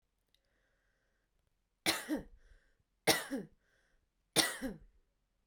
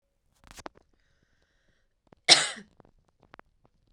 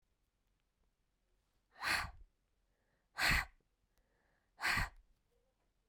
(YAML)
three_cough_length: 5.5 s
three_cough_amplitude: 7743
three_cough_signal_mean_std_ratio: 0.29
cough_length: 3.9 s
cough_amplitude: 27303
cough_signal_mean_std_ratio: 0.16
exhalation_length: 5.9 s
exhalation_amplitude: 3097
exhalation_signal_mean_std_ratio: 0.3
survey_phase: beta (2021-08-13 to 2022-03-07)
age: 18-44
gender: Female
wearing_mask: 'No'
symptom_none: true
smoker_status: Never smoked
respiratory_condition_asthma: false
respiratory_condition_other: false
recruitment_source: REACT
submission_delay: 3 days
covid_test_result: Negative
covid_test_method: RT-qPCR